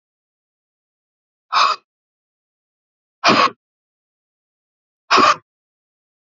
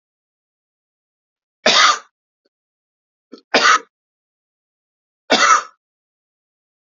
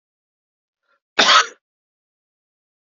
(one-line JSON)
{"exhalation_length": "6.3 s", "exhalation_amplitude": 28225, "exhalation_signal_mean_std_ratio": 0.27, "three_cough_length": "6.9 s", "three_cough_amplitude": 31860, "three_cough_signal_mean_std_ratio": 0.28, "cough_length": "2.8 s", "cough_amplitude": 30330, "cough_signal_mean_std_ratio": 0.24, "survey_phase": "beta (2021-08-13 to 2022-03-07)", "age": "45-64", "gender": "Male", "wearing_mask": "No", "symptom_fatigue": true, "symptom_other": true, "smoker_status": "Ex-smoker", "respiratory_condition_asthma": false, "respiratory_condition_other": false, "recruitment_source": "Test and Trace", "submission_delay": "1 day", "covid_test_result": "Positive", "covid_test_method": "RT-qPCR", "covid_ct_value": 28.9, "covid_ct_gene": "ORF1ab gene", "covid_ct_mean": 29.6, "covid_viral_load": "190 copies/ml", "covid_viral_load_category": "Minimal viral load (< 10K copies/ml)"}